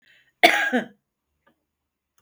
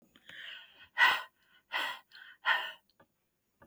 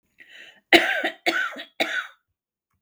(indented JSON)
{
  "cough_length": "2.2 s",
  "cough_amplitude": 32767,
  "cough_signal_mean_std_ratio": 0.28,
  "exhalation_length": "3.7 s",
  "exhalation_amplitude": 7924,
  "exhalation_signal_mean_std_ratio": 0.34,
  "three_cough_length": "2.8 s",
  "three_cough_amplitude": 32768,
  "three_cough_signal_mean_std_ratio": 0.38,
  "survey_phase": "beta (2021-08-13 to 2022-03-07)",
  "age": "45-64",
  "gender": "Female",
  "wearing_mask": "No",
  "symptom_none": true,
  "smoker_status": "Current smoker (11 or more cigarettes per day)",
  "respiratory_condition_asthma": false,
  "respiratory_condition_other": false,
  "recruitment_source": "REACT",
  "submission_delay": "3 days",
  "covid_test_result": "Negative",
  "covid_test_method": "RT-qPCR"
}